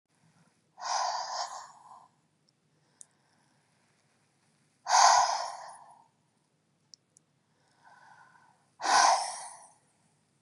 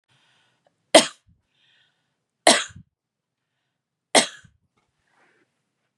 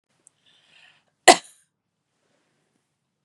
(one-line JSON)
{"exhalation_length": "10.4 s", "exhalation_amplitude": 13281, "exhalation_signal_mean_std_ratio": 0.31, "three_cough_length": "6.0 s", "three_cough_amplitude": 32768, "three_cough_signal_mean_std_ratio": 0.18, "cough_length": "3.2 s", "cough_amplitude": 32768, "cough_signal_mean_std_ratio": 0.12, "survey_phase": "beta (2021-08-13 to 2022-03-07)", "age": "45-64", "gender": "Female", "wearing_mask": "No", "symptom_none": true, "smoker_status": "Never smoked", "respiratory_condition_asthma": false, "respiratory_condition_other": false, "recruitment_source": "REACT", "submission_delay": "1 day", "covid_test_result": "Negative", "covid_test_method": "RT-qPCR"}